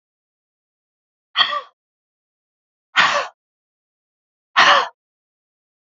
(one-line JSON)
{"exhalation_length": "5.9 s", "exhalation_amplitude": 32767, "exhalation_signal_mean_std_ratio": 0.28, "survey_phase": "beta (2021-08-13 to 2022-03-07)", "age": "45-64", "gender": "Female", "wearing_mask": "No", "symptom_runny_or_blocked_nose": true, "smoker_status": "Never smoked", "respiratory_condition_asthma": true, "respiratory_condition_other": false, "recruitment_source": "REACT", "submission_delay": "1 day", "covid_test_result": "Negative", "covid_test_method": "RT-qPCR", "influenza_a_test_result": "Unknown/Void", "influenza_b_test_result": "Unknown/Void"}